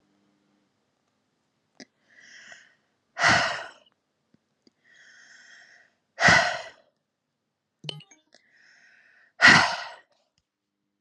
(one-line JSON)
{"exhalation_length": "11.0 s", "exhalation_amplitude": 30218, "exhalation_signal_mean_std_ratio": 0.25, "survey_phase": "beta (2021-08-13 to 2022-03-07)", "age": "18-44", "gender": "Female", "wearing_mask": "No", "symptom_cough_any": true, "symptom_runny_or_blocked_nose": true, "symptom_shortness_of_breath": true, "symptom_sore_throat": true, "symptom_fatigue": true, "symptom_headache": true, "symptom_change_to_sense_of_smell_or_taste": true, "symptom_onset": "9 days", "smoker_status": "Never smoked", "respiratory_condition_asthma": false, "respiratory_condition_other": false, "recruitment_source": "Test and Trace", "submission_delay": "1 day", "covid_test_result": "Positive", "covid_test_method": "RT-qPCR", "covid_ct_value": 26.0, "covid_ct_gene": "N gene"}